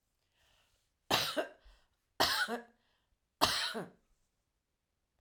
{
  "three_cough_length": "5.2 s",
  "three_cough_amplitude": 10794,
  "three_cough_signal_mean_std_ratio": 0.36,
  "survey_phase": "alpha (2021-03-01 to 2021-08-12)",
  "age": "45-64",
  "gender": "Female",
  "wearing_mask": "No",
  "symptom_none": true,
  "smoker_status": "Never smoked",
  "respiratory_condition_asthma": false,
  "respiratory_condition_other": false,
  "recruitment_source": "REACT",
  "submission_delay": "0 days",
  "covid_test_result": "Negative",
  "covid_test_method": "RT-qPCR"
}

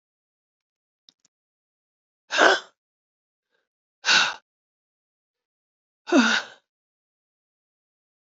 {
  "exhalation_length": "8.4 s",
  "exhalation_amplitude": 29027,
  "exhalation_signal_mean_std_ratio": 0.24,
  "survey_phase": "beta (2021-08-13 to 2022-03-07)",
  "age": "65+",
  "gender": "Female",
  "wearing_mask": "No",
  "symptom_new_continuous_cough": true,
  "symptom_runny_or_blocked_nose": true,
  "symptom_shortness_of_breath": true,
  "symptom_sore_throat": true,
  "symptom_abdominal_pain": true,
  "symptom_fatigue": true,
  "symptom_fever_high_temperature": true,
  "symptom_headache": true,
  "symptom_change_to_sense_of_smell_or_taste": true,
  "symptom_onset": "4 days",
  "smoker_status": "Ex-smoker",
  "respiratory_condition_asthma": true,
  "respiratory_condition_other": false,
  "recruitment_source": "Test and Trace",
  "submission_delay": "1 day",
  "covid_test_result": "Positive",
  "covid_test_method": "RT-qPCR",
  "covid_ct_value": 15.4,
  "covid_ct_gene": "ORF1ab gene",
  "covid_ct_mean": 15.4,
  "covid_viral_load": "9000000 copies/ml",
  "covid_viral_load_category": "High viral load (>1M copies/ml)"
}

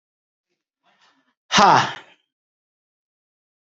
{
  "exhalation_length": "3.8 s",
  "exhalation_amplitude": 28285,
  "exhalation_signal_mean_std_ratio": 0.24,
  "survey_phase": "beta (2021-08-13 to 2022-03-07)",
  "age": "45-64",
  "gender": "Male",
  "wearing_mask": "No",
  "symptom_none": true,
  "smoker_status": "Never smoked",
  "respiratory_condition_asthma": false,
  "respiratory_condition_other": false,
  "recruitment_source": "REACT",
  "submission_delay": "1 day",
  "covid_test_result": "Negative",
  "covid_test_method": "RT-qPCR",
  "influenza_a_test_result": "Negative",
  "influenza_b_test_result": "Negative"
}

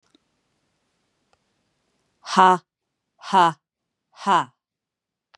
{
  "exhalation_length": "5.4 s",
  "exhalation_amplitude": 26686,
  "exhalation_signal_mean_std_ratio": 0.25,
  "survey_phase": "beta (2021-08-13 to 2022-03-07)",
  "age": "45-64",
  "gender": "Female",
  "wearing_mask": "No",
  "symptom_none": true,
  "smoker_status": "Ex-smoker",
  "respiratory_condition_asthma": false,
  "respiratory_condition_other": false,
  "recruitment_source": "REACT",
  "submission_delay": "2 days",
  "covid_test_result": "Negative",
  "covid_test_method": "RT-qPCR",
  "influenza_a_test_result": "Negative",
  "influenza_b_test_result": "Negative"
}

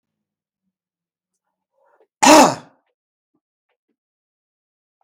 {
  "cough_length": "5.0 s",
  "cough_amplitude": 32768,
  "cough_signal_mean_std_ratio": 0.2,
  "survey_phase": "beta (2021-08-13 to 2022-03-07)",
  "age": "65+",
  "gender": "Male",
  "wearing_mask": "No",
  "symptom_none": true,
  "smoker_status": "Ex-smoker",
  "respiratory_condition_asthma": false,
  "respiratory_condition_other": false,
  "recruitment_source": "REACT",
  "submission_delay": "7 days",
  "covid_test_result": "Negative",
  "covid_test_method": "RT-qPCR",
  "influenza_a_test_result": "Negative",
  "influenza_b_test_result": "Negative"
}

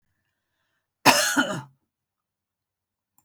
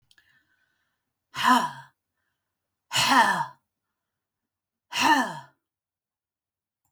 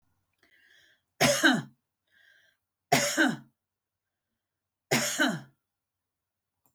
{
  "cough_length": "3.2 s",
  "cough_amplitude": 31839,
  "cough_signal_mean_std_ratio": 0.28,
  "exhalation_length": "6.9 s",
  "exhalation_amplitude": 17277,
  "exhalation_signal_mean_std_ratio": 0.33,
  "three_cough_length": "6.7 s",
  "three_cough_amplitude": 11667,
  "three_cough_signal_mean_std_ratio": 0.34,
  "survey_phase": "beta (2021-08-13 to 2022-03-07)",
  "age": "65+",
  "gender": "Female",
  "wearing_mask": "No",
  "symptom_none": true,
  "smoker_status": "Ex-smoker",
  "respiratory_condition_asthma": false,
  "respiratory_condition_other": false,
  "recruitment_source": "REACT",
  "submission_delay": "2 days",
  "covid_test_result": "Negative",
  "covid_test_method": "RT-qPCR",
  "influenza_a_test_result": "Negative",
  "influenza_b_test_result": "Negative"
}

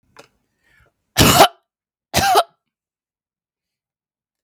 {
  "cough_length": "4.4 s",
  "cough_amplitude": 32768,
  "cough_signal_mean_std_ratio": 0.29,
  "survey_phase": "beta (2021-08-13 to 2022-03-07)",
  "age": "45-64",
  "gender": "Female",
  "wearing_mask": "No",
  "symptom_none": true,
  "smoker_status": "Ex-smoker",
  "respiratory_condition_asthma": false,
  "respiratory_condition_other": false,
  "recruitment_source": "REACT",
  "submission_delay": "1 day",
  "covid_test_result": "Negative",
  "covid_test_method": "RT-qPCR",
  "influenza_a_test_result": "Negative",
  "influenza_b_test_result": "Negative"
}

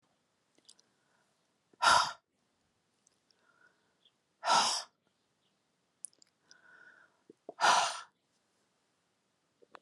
{
  "exhalation_length": "9.8 s",
  "exhalation_amplitude": 7750,
  "exhalation_signal_mean_std_ratio": 0.25,
  "survey_phase": "alpha (2021-03-01 to 2021-08-12)",
  "age": "65+",
  "gender": "Female",
  "wearing_mask": "No",
  "symptom_none": true,
  "smoker_status": "Never smoked",
  "respiratory_condition_asthma": false,
  "respiratory_condition_other": false,
  "recruitment_source": "REACT",
  "submission_delay": "2 days",
  "covid_test_result": "Negative",
  "covid_test_method": "RT-qPCR"
}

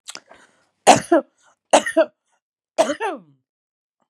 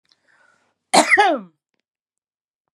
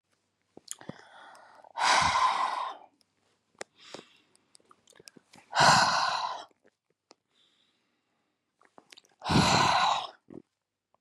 {
  "three_cough_length": "4.1 s",
  "three_cough_amplitude": 32767,
  "three_cough_signal_mean_std_ratio": 0.3,
  "cough_length": "2.7 s",
  "cough_amplitude": 32387,
  "cough_signal_mean_std_ratio": 0.31,
  "exhalation_length": "11.0 s",
  "exhalation_amplitude": 12651,
  "exhalation_signal_mean_std_ratio": 0.39,
  "survey_phase": "beta (2021-08-13 to 2022-03-07)",
  "age": "45-64",
  "gender": "Female",
  "wearing_mask": "No",
  "symptom_runny_or_blocked_nose": true,
  "symptom_sore_throat": true,
  "symptom_fatigue": true,
  "symptom_onset": "12 days",
  "smoker_status": "Current smoker (11 or more cigarettes per day)",
  "respiratory_condition_asthma": false,
  "respiratory_condition_other": false,
  "recruitment_source": "REACT",
  "submission_delay": "1 day",
  "covid_test_result": "Negative",
  "covid_test_method": "RT-qPCR",
  "influenza_a_test_result": "Negative",
  "influenza_b_test_result": "Negative"
}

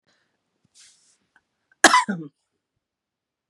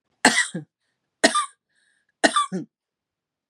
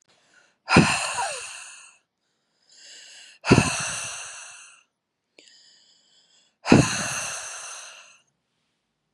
{
  "cough_length": "3.5 s",
  "cough_amplitude": 32767,
  "cough_signal_mean_std_ratio": 0.2,
  "three_cough_length": "3.5 s",
  "three_cough_amplitude": 32767,
  "three_cough_signal_mean_std_ratio": 0.33,
  "exhalation_length": "9.1 s",
  "exhalation_amplitude": 32760,
  "exhalation_signal_mean_std_ratio": 0.33,
  "survey_phase": "beta (2021-08-13 to 2022-03-07)",
  "age": "45-64",
  "gender": "Female",
  "wearing_mask": "No",
  "symptom_fatigue": true,
  "symptom_onset": "12 days",
  "smoker_status": "Never smoked",
  "respiratory_condition_asthma": false,
  "respiratory_condition_other": false,
  "recruitment_source": "REACT",
  "submission_delay": "2 days",
  "covid_test_result": "Negative",
  "covid_test_method": "RT-qPCR",
  "influenza_a_test_result": "Negative",
  "influenza_b_test_result": "Negative"
}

